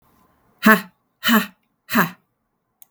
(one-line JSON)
{"exhalation_length": "2.9 s", "exhalation_amplitude": 32768, "exhalation_signal_mean_std_ratio": 0.32, "survey_phase": "beta (2021-08-13 to 2022-03-07)", "age": "45-64", "gender": "Female", "wearing_mask": "No", "symptom_cough_any": true, "symptom_runny_or_blocked_nose": true, "symptom_abdominal_pain": true, "symptom_fatigue": true, "symptom_headache": true, "symptom_change_to_sense_of_smell_or_taste": true, "symptom_onset": "3 days", "smoker_status": "Never smoked", "respiratory_condition_asthma": false, "respiratory_condition_other": false, "recruitment_source": "Test and Trace", "submission_delay": "2 days", "covid_test_result": "Positive", "covid_test_method": "RT-qPCR", "covid_ct_value": 20.8, "covid_ct_gene": "ORF1ab gene"}